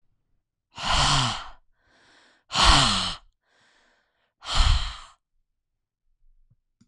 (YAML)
exhalation_length: 6.9 s
exhalation_amplitude: 23394
exhalation_signal_mean_std_ratio: 0.38
survey_phase: beta (2021-08-13 to 2022-03-07)
age: 18-44
gender: Female
wearing_mask: 'No'
symptom_none: true
smoker_status: Never smoked
respiratory_condition_asthma: false
respiratory_condition_other: false
recruitment_source: REACT
submission_delay: 5 days
covid_test_result: Negative
covid_test_method: RT-qPCR